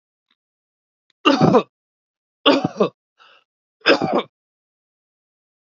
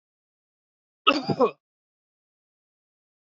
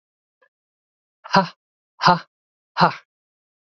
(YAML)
three_cough_length: 5.7 s
three_cough_amplitude: 32768
three_cough_signal_mean_std_ratio: 0.31
cough_length: 3.2 s
cough_amplitude: 25935
cough_signal_mean_std_ratio: 0.23
exhalation_length: 3.7 s
exhalation_amplitude: 31865
exhalation_signal_mean_std_ratio: 0.25
survey_phase: alpha (2021-03-01 to 2021-08-12)
age: 18-44
gender: Male
wearing_mask: 'No'
symptom_none: true
smoker_status: Ex-smoker
respiratory_condition_asthma: false
respiratory_condition_other: false
recruitment_source: REACT
submission_delay: 1 day
covid_test_result: Negative
covid_test_method: RT-qPCR